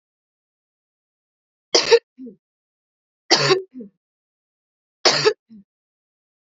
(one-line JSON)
{"three_cough_length": "6.6 s", "three_cough_amplitude": 32768, "three_cough_signal_mean_std_ratio": 0.26, "survey_phase": "beta (2021-08-13 to 2022-03-07)", "age": "18-44", "gender": "Female", "wearing_mask": "No", "symptom_cough_any": true, "symptom_runny_or_blocked_nose": true, "symptom_sore_throat": true, "symptom_fatigue": true, "smoker_status": "Never smoked", "respiratory_condition_asthma": false, "respiratory_condition_other": false, "recruitment_source": "Test and Trace", "submission_delay": "2 days", "covid_test_result": "Positive", "covid_test_method": "LFT"}